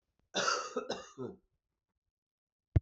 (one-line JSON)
{"cough_length": "2.8 s", "cough_amplitude": 6548, "cough_signal_mean_std_ratio": 0.33, "survey_phase": "beta (2021-08-13 to 2022-03-07)", "age": "65+", "gender": "Male", "wearing_mask": "No", "symptom_cough_any": true, "symptom_fatigue": true, "symptom_headache": true, "symptom_onset": "6 days", "smoker_status": "Never smoked", "respiratory_condition_asthma": false, "respiratory_condition_other": false, "recruitment_source": "Test and Trace", "submission_delay": "1 day", "covid_test_result": "Positive", "covid_test_method": "RT-qPCR"}